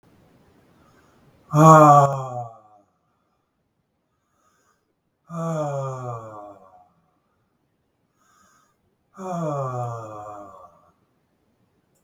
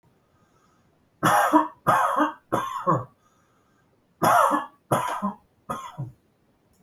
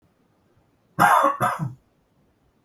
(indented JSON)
{
  "exhalation_length": "12.0 s",
  "exhalation_amplitude": 32768,
  "exhalation_signal_mean_std_ratio": 0.28,
  "three_cough_length": "6.8 s",
  "three_cough_amplitude": 20038,
  "three_cough_signal_mean_std_ratio": 0.47,
  "cough_length": "2.6 s",
  "cough_amplitude": 22537,
  "cough_signal_mean_std_ratio": 0.39,
  "survey_phase": "beta (2021-08-13 to 2022-03-07)",
  "age": "45-64",
  "gender": "Male",
  "wearing_mask": "No",
  "symptom_none": true,
  "smoker_status": "Never smoked",
  "respiratory_condition_asthma": false,
  "respiratory_condition_other": false,
  "recruitment_source": "REACT",
  "submission_delay": "1 day",
  "covid_test_result": "Negative",
  "covid_test_method": "RT-qPCR"
}